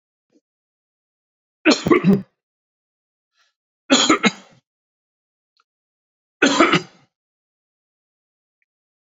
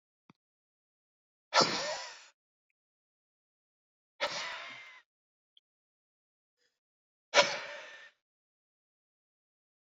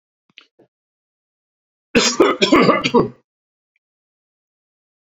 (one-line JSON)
{"three_cough_length": "9.0 s", "three_cough_amplitude": 28757, "three_cough_signal_mean_std_ratio": 0.28, "exhalation_length": "9.9 s", "exhalation_amplitude": 11984, "exhalation_signal_mean_std_ratio": 0.23, "cough_length": "5.1 s", "cough_amplitude": 29050, "cough_signal_mean_std_ratio": 0.33, "survey_phase": "beta (2021-08-13 to 2022-03-07)", "age": "45-64", "gender": "Male", "wearing_mask": "No", "symptom_none": true, "smoker_status": "Never smoked", "respiratory_condition_asthma": false, "respiratory_condition_other": false, "recruitment_source": "REACT", "submission_delay": "1 day", "covid_test_result": "Negative", "covid_test_method": "RT-qPCR"}